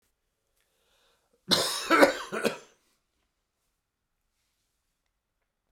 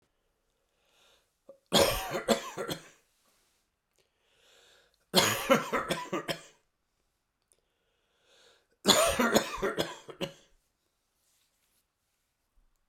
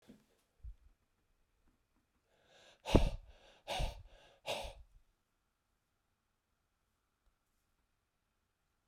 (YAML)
cough_length: 5.7 s
cough_amplitude: 23129
cough_signal_mean_std_ratio: 0.26
three_cough_length: 12.9 s
three_cough_amplitude: 17089
three_cough_signal_mean_std_ratio: 0.33
exhalation_length: 8.9 s
exhalation_amplitude: 9971
exhalation_signal_mean_std_ratio: 0.2
survey_phase: beta (2021-08-13 to 2022-03-07)
age: 45-64
gender: Male
wearing_mask: 'No'
symptom_cough_any: true
symptom_fatigue: true
symptom_headache: true
symptom_onset: 4 days
smoker_status: Ex-smoker
respiratory_condition_asthma: false
respiratory_condition_other: false
recruitment_source: Test and Trace
submission_delay: 3 days
covid_test_result: Positive
covid_test_method: RT-qPCR
covid_ct_value: 15.1
covid_ct_gene: ORF1ab gene
covid_ct_mean: 16.4
covid_viral_load: 4300000 copies/ml
covid_viral_load_category: High viral load (>1M copies/ml)